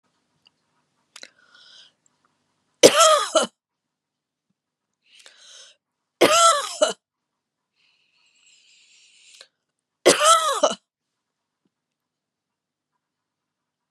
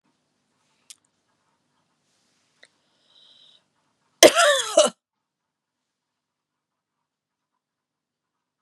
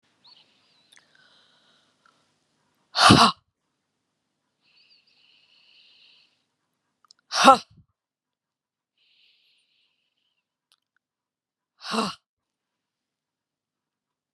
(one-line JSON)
{"three_cough_length": "13.9 s", "three_cough_amplitude": 32768, "three_cough_signal_mean_std_ratio": 0.26, "cough_length": "8.6 s", "cough_amplitude": 32768, "cough_signal_mean_std_ratio": 0.18, "exhalation_length": "14.3 s", "exhalation_amplitude": 32683, "exhalation_signal_mean_std_ratio": 0.17, "survey_phase": "beta (2021-08-13 to 2022-03-07)", "age": "45-64", "gender": "Female", "wearing_mask": "No", "symptom_runny_or_blocked_nose": true, "symptom_sore_throat": true, "symptom_fatigue": true, "smoker_status": "Never smoked", "respiratory_condition_asthma": false, "respiratory_condition_other": false, "recruitment_source": "REACT", "submission_delay": "3 days", "covid_test_result": "Negative", "covid_test_method": "RT-qPCR", "influenza_a_test_result": "Negative", "influenza_b_test_result": "Negative"}